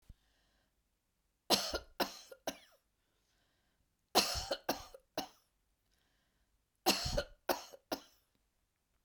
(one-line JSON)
{"three_cough_length": "9.0 s", "three_cough_amplitude": 6434, "three_cough_signal_mean_std_ratio": 0.3, "survey_phase": "beta (2021-08-13 to 2022-03-07)", "age": "65+", "gender": "Female", "wearing_mask": "No", "symptom_none": true, "smoker_status": "Never smoked", "respiratory_condition_asthma": false, "respiratory_condition_other": false, "recruitment_source": "REACT", "submission_delay": "2 days", "covid_test_result": "Negative", "covid_test_method": "RT-qPCR", "influenza_a_test_result": "Negative", "influenza_b_test_result": "Negative"}